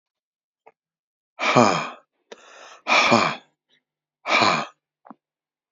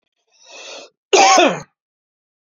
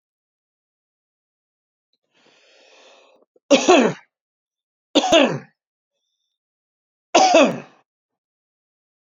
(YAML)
exhalation_length: 5.7 s
exhalation_amplitude: 27404
exhalation_signal_mean_std_ratio: 0.37
cough_length: 2.5 s
cough_amplitude: 32767
cough_signal_mean_std_ratio: 0.37
three_cough_length: 9.0 s
three_cough_amplitude: 32767
three_cough_signal_mean_std_ratio: 0.28
survey_phase: beta (2021-08-13 to 2022-03-07)
age: 65+
gender: Male
wearing_mask: 'No'
symptom_none: true
smoker_status: Never smoked
respiratory_condition_asthma: true
respiratory_condition_other: false
recruitment_source: REACT
submission_delay: 14 days
covid_test_result: Negative
covid_test_method: RT-qPCR